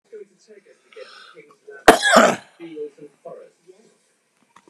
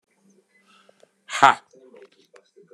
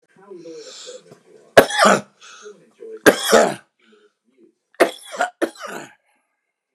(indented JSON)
{
  "cough_length": "4.7 s",
  "cough_amplitude": 32768,
  "cough_signal_mean_std_ratio": 0.27,
  "exhalation_length": "2.7 s",
  "exhalation_amplitude": 32767,
  "exhalation_signal_mean_std_ratio": 0.18,
  "three_cough_length": "6.7 s",
  "three_cough_amplitude": 32768,
  "three_cough_signal_mean_std_ratio": 0.31,
  "survey_phase": "beta (2021-08-13 to 2022-03-07)",
  "age": "45-64",
  "gender": "Male",
  "wearing_mask": "No",
  "symptom_cough_any": true,
  "symptom_new_continuous_cough": true,
  "symptom_runny_or_blocked_nose": true,
  "symptom_shortness_of_breath": true,
  "symptom_sore_throat": true,
  "symptom_fatigue": true,
  "symptom_onset": "3 days",
  "smoker_status": "Ex-smoker",
  "respiratory_condition_asthma": true,
  "respiratory_condition_other": true,
  "recruitment_source": "Test and Trace",
  "submission_delay": "2 days",
  "covid_test_result": "Positive",
  "covid_test_method": "RT-qPCR",
  "covid_ct_value": 17.4,
  "covid_ct_gene": "N gene"
}